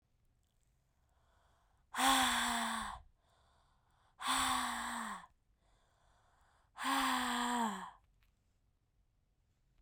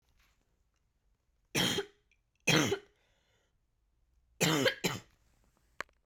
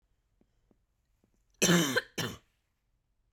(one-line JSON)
{"exhalation_length": "9.8 s", "exhalation_amplitude": 3933, "exhalation_signal_mean_std_ratio": 0.46, "three_cough_length": "6.1 s", "three_cough_amplitude": 6696, "three_cough_signal_mean_std_ratio": 0.33, "cough_length": "3.3 s", "cough_amplitude": 8632, "cough_signal_mean_std_ratio": 0.3, "survey_phase": "beta (2021-08-13 to 2022-03-07)", "age": "18-44", "gender": "Female", "wearing_mask": "No", "symptom_cough_any": true, "symptom_runny_or_blocked_nose": true, "symptom_headache": true, "symptom_onset": "4 days", "smoker_status": "Never smoked", "respiratory_condition_asthma": true, "respiratory_condition_other": false, "recruitment_source": "Test and Trace", "submission_delay": "2 days", "covid_test_result": "Positive", "covid_test_method": "RT-qPCR", "covid_ct_value": 26.1, "covid_ct_gene": "ORF1ab gene", "covid_ct_mean": 26.3, "covid_viral_load": "2400 copies/ml", "covid_viral_load_category": "Minimal viral load (< 10K copies/ml)"}